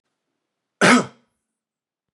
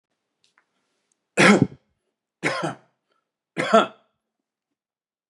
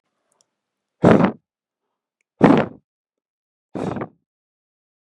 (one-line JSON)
{"cough_length": "2.1 s", "cough_amplitude": 28059, "cough_signal_mean_std_ratio": 0.26, "three_cough_length": "5.3 s", "three_cough_amplitude": 29489, "three_cough_signal_mean_std_ratio": 0.27, "exhalation_length": "5.0 s", "exhalation_amplitude": 32768, "exhalation_signal_mean_std_ratio": 0.27, "survey_phase": "beta (2021-08-13 to 2022-03-07)", "age": "45-64", "gender": "Male", "wearing_mask": "No", "symptom_none": true, "smoker_status": "Ex-smoker", "respiratory_condition_asthma": true, "respiratory_condition_other": false, "recruitment_source": "REACT", "submission_delay": "2 days", "covid_test_result": "Negative", "covid_test_method": "RT-qPCR"}